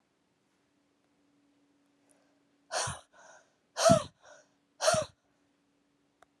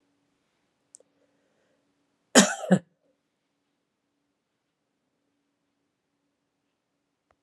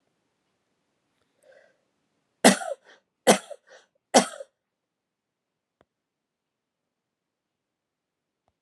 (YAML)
exhalation_length: 6.4 s
exhalation_amplitude: 12834
exhalation_signal_mean_std_ratio: 0.24
cough_length: 7.4 s
cough_amplitude: 30681
cough_signal_mean_std_ratio: 0.14
three_cough_length: 8.6 s
three_cough_amplitude: 27877
three_cough_signal_mean_std_ratio: 0.16
survey_phase: beta (2021-08-13 to 2022-03-07)
age: 45-64
gender: Female
wearing_mask: 'No'
symptom_runny_or_blocked_nose: true
smoker_status: Never smoked
respiratory_condition_asthma: false
respiratory_condition_other: false
recruitment_source: REACT
submission_delay: 2 days
covid_test_result: Negative
covid_test_method: RT-qPCR